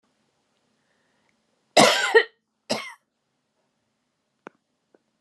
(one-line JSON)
{"cough_length": "5.2 s", "cough_amplitude": 28891, "cough_signal_mean_std_ratio": 0.23, "survey_phase": "beta (2021-08-13 to 2022-03-07)", "age": "45-64", "gender": "Female", "wearing_mask": "No", "symptom_none": true, "smoker_status": "Never smoked", "respiratory_condition_asthma": false, "respiratory_condition_other": false, "recruitment_source": "REACT", "submission_delay": "3 days", "covid_test_result": "Negative", "covid_test_method": "RT-qPCR", "influenza_a_test_result": "Unknown/Void", "influenza_b_test_result": "Unknown/Void"}